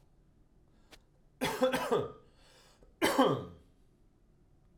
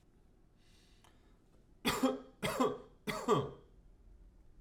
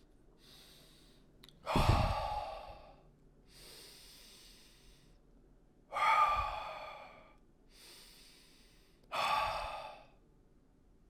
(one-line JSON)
{"cough_length": "4.8 s", "cough_amplitude": 7110, "cough_signal_mean_std_ratio": 0.38, "three_cough_length": "4.6 s", "three_cough_amplitude": 4193, "three_cough_signal_mean_std_ratio": 0.41, "exhalation_length": "11.1 s", "exhalation_amplitude": 4570, "exhalation_signal_mean_std_ratio": 0.42, "survey_phase": "alpha (2021-03-01 to 2021-08-12)", "age": "45-64", "gender": "Male", "wearing_mask": "No", "symptom_none": true, "symptom_cough_any": true, "smoker_status": "Never smoked", "respiratory_condition_asthma": false, "respiratory_condition_other": false, "recruitment_source": "REACT", "submission_delay": "1 day", "covid_test_result": "Negative", "covid_test_method": "RT-qPCR"}